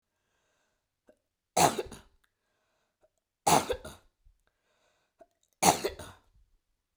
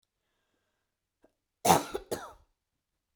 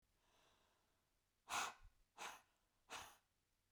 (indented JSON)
{
  "three_cough_length": "7.0 s",
  "three_cough_amplitude": 18698,
  "three_cough_signal_mean_std_ratio": 0.24,
  "cough_length": "3.2 s",
  "cough_amplitude": 17983,
  "cough_signal_mean_std_ratio": 0.22,
  "exhalation_length": "3.7 s",
  "exhalation_amplitude": 802,
  "exhalation_signal_mean_std_ratio": 0.33,
  "survey_phase": "beta (2021-08-13 to 2022-03-07)",
  "age": "45-64",
  "gender": "Female",
  "wearing_mask": "No",
  "symptom_sore_throat": true,
  "symptom_fatigue": true,
  "symptom_headache": true,
  "smoker_status": "Never smoked",
  "respiratory_condition_asthma": true,
  "respiratory_condition_other": false,
  "recruitment_source": "Test and Trace",
  "submission_delay": "2 days",
  "covid_test_result": "Positive",
  "covid_test_method": "RT-qPCR",
  "covid_ct_value": 27.3,
  "covid_ct_gene": "ORF1ab gene",
  "covid_ct_mean": 28.0,
  "covid_viral_load": "650 copies/ml",
  "covid_viral_load_category": "Minimal viral load (< 10K copies/ml)"
}